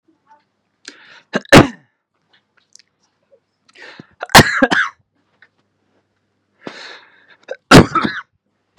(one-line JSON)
{"three_cough_length": "8.8 s", "three_cough_amplitude": 32768, "three_cough_signal_mean_std_ratio": 0.25, "survey_phase": "beta (2021-08-13 to 2022-03-07)", "age": "18-44", "gender": "Male", "wearing_mask": "No", "symptom_none": true, "smoker_status": "Ex-smoker", "respiratory_condition_asthma": true, "respiratory_condition_other": false, "recruitment_source": "REACT", "submission_delay": "1 day", "covid_test_result": "Negative", "covid_test_method": "RT-qPCR", "influenza_a_test_result": "Negative", "influenza_b_test_result": "Negative"}